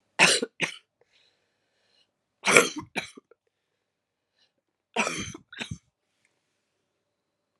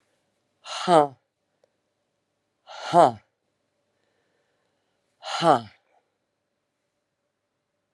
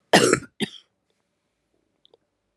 {"three_cough_length": "7.6 s", "three_cough_amplitude": 32768, "three_cough_signal_mean_std_ratio": 0.25, "exhalation_length": "7.9 s", "exhalation_amplitude": 25567, "exhalation_signal_mean_std_ratio": 0.22, "cough_length": "2.6 s", "cough_amplitude": 29637, "cough_signal_mean_std_ratio": 0.25, "survey_phase": "beta (2021-08-13 to 2022-03-07)", "age": "65+", "gender": "Female", "wearing_mask": "No", "symptom_cough_any": true, "symptom_runny_or_blocked_nose": true, "symptom_sore_throat": true, "symptom_abdominal_pain": true, "symptom_fatigue": true, "symptom_fever_high_temperature": true, "symptom_headache": true, "symptom_change_to_sense_of_smell_or_taste": true, "symptom_loss_of_taste": true, "symptom_onset": "2 days", "smoker_status": "Ex-smoker", "respiratory_condition_asthma": false, "respiratory_condition_other": false, "recruitment_source": "Test and Trace", "submission_delay": "2 days", "covid_test_result": "Positive", "covid_test_method": "RT-qPCR", "covid_ct_value": 14.3, "covid_ct_gene": "ORF1ab gene", "covid_ct_mean": 14.9, "covid_viral_load": "13000000 copies/ml", "covid_viral_load_category": "High viral load (>1M copies/ml)"}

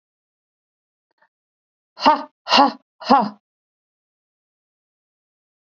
{"exhalation_length": "5.7 s", "exhalation_amplitude": 28148, "exhalation_signal_mean_std_ratio": 0.24, "survey_phase": "beta (2021-08-13 to 2022-03-07)", "age": "45-64", "gender": "Female", "wearing_mask": "No", "symptom_none": true, "smoker_status": "Never smoked", "respiratory_condition_asthma": false, "respiratory_condition_other": false, "recruitment_source": "REACT", "submission_delay": "1 day", "covid_test_result": "Negative", "covid_test_method": "RT-qPCR", "influenza_a_test_result": "Negative", "influenza_b_test_result": "Negative"}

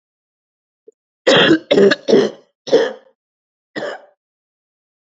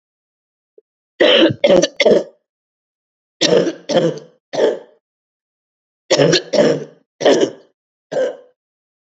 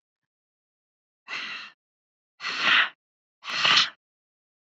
{"cough_length": "5.0 s", "cough_amplitude": 29957, "cough_signal_mean_std_ratio": 0.38, "three_cough_length": "9.1 s", "three_cough_amplitude": 32768, "three_cough_signal_mean_std_ratio": 0.44, "exhalation_length": "4.8 s", "exhalation_amplitude": 22869, "exhalation_signal_mean_std_ratio": 0.34, "survey_phase": "beta (2021-08-13 to 2022-03-07)", "age": "45-64", "gender": "Female", "wearing_mask": "No", "symptom_cough_any": true, "symptom_runny_or_blocked_nose": true, "symptom_sore_throat": true, "symptom_fatigue": true, "symptom_fever_high_temperature": true, "symptom_headache": true, "symptom_onset": "5 days", "smoker_status": "Never smoked", "respiratory_condition_asthma": false, "respiratory_condition_other": false, "recruitment_source": "Test and Trace", "submission_delay": "2 days", "covid_test_result": "Positive", "covid_test_method": "RT-qPCR", "covid_ct_value": 18.9, "covid_ct_gene": "N gene"}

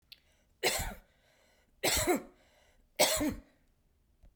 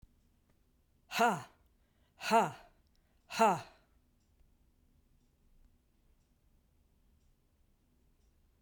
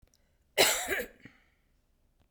{"three_cough_length": "4.4 s", "three_cough_amplitude": 8468, "three_cough_signal_mean_std_ratio": 0.4, "exhalation_length": "8.6 s", "exhalation_amplitude": 5561, "exhalation_signal_mean_std_ratio": 0.25, "cough_length": "2.3 s", "cough_amplitude": 14164, "cough_signal_mean_std_ratio": 0.33, "survey_phase": "beta (2021-08-13 to 2022-03-07)", "age": "65+", "gender": "Female", "wearing_mask": "No", "symptom_none": true, "smoker_status": "Never smoked", "respiratory_condition_asthma": false, "respiratory_condition_other": false, "recruitment_source": "REACT", "submission_delay": "1 day", "covid_test_result": "Negative", "covid_test_method": "RT-qPCR"}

